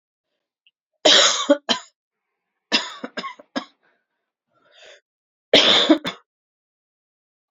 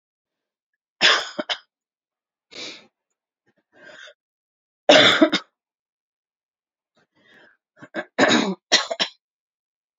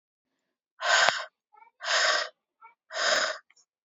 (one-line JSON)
{"cough_length": "7.5 s", "cough_amplitude": 30360, "cough_signal_mean_std_ratio": 0.31, "three_cough_length": "10.0 s", "three_cough_amplitude": 28655, "three_cough_signal_mean_std_ratio": 0.28, "exhalation_length": "3.8 s", "exhalation_amplitude": 32767, "exhalation_signal_mean_std_ratio": 0.46, "survey_phase": "beta (2021-08-13 to 2022-03-07)", "age": "18-44", "gender": "Female", "wearing_mask": "No", "symptom_cough_any": true, "symptom_runny_or_blocked_nose": true, "symptom_fatigue": true, "symptom_change_to_sense_of_smell_or_taste": true, "symptom_loss_of_taste": true, "symptom_other": true, "symptom_onset": "4 days", "smoker_status": "Never smoked", "respiratory_condition_asthma": false, "respiratory_condition_other": false, "recruitment_source": "Test and Trace", "submission_delay": "2 days", "covid_test_result": "Positive", "covid_test_method": "RT-qPCR", "covid_ct_value": 17.9, "covid_ct_gene": "ORF1ab gene"}